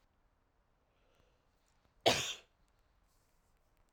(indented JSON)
{
  "cough_length": "3.9 s",
  "cough_amplitude": 6229,
  "cough_signal_mean_std_ratio": 0.2,
  "survey_phase": "alpha (2021-03-01 to 2021-08-12)",
  "age": "18-44",
  "gender": "Female",
  "wearing_mask": "No",
  "symptom_cough_any": true,
  "symptom_fatigue": true,
  "symptom_headache": true,
  "symptom_loss_of_taste": true,
  "symptom_onset": "4 days",
  "smoker_status": "Never smoked",
  "respiratory_condition_asthma": false,
  "respiratory_condition_other": false,
  "recruitment_source": "Test and Trace",
  "submission_delay": "2 days",
  "covid_test_result": "Positive",
  "covid_test_method": "RT-qPCR"
}